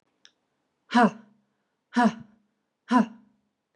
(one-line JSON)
{"exhalation_length": "3.8 s", "exhalation_amplitude": 14976, "exhalation_signal_mean_std_ratio": 0.3, "survey_phase": "beta (2021-08-13 to 2022-03-07)", "age": "18-44", "gender": "Female", "wearing_mask": "No", "symptom_cough_any": true, "smoker_status": "Never smoked", "respiratory_condition_asthma": false, "respiratory_condition_other": false, "recruitment_source": "REACT", "submission_delay": "1 day", "covid_test_result": "Negative", "covid_test_method": "RT-qPCR", "influenza_a_test_result": "Negative", "influenza_b_test_result": "Negative"}